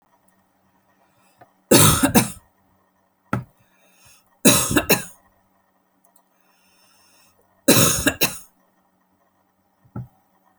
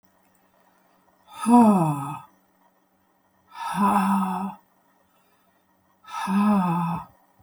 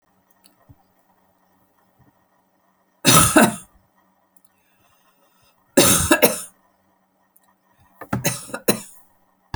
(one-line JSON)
{"three_cough_length": "10.6 s", "three_cough_amplitude": 32767, "three_cough_signal_mean_std_ratio": 0.3, "exhalation_length": "7.4 s", "exhalation_amplitude": 18280, "exhalation_signal_mean_std_ratio": 0.47, "cough_length": "9.6 s", "cough_amplitude": 32768, "cough_signal_mean_std_ratio": 0.29, "survey_phase": "beta (2021-08-13 to 2022-03-07)", "age": "65+", "gender": "Female", "wearing_mask": "No", "symptom_none": true, "smoker_status": "Ex-smoker", "respiratory_condition_asthma": false, "respiratory_condition_other": false, "recruitment_source": "REACT", "submission_delay": "2 days", "covid_test_method": "RT-qPCR"}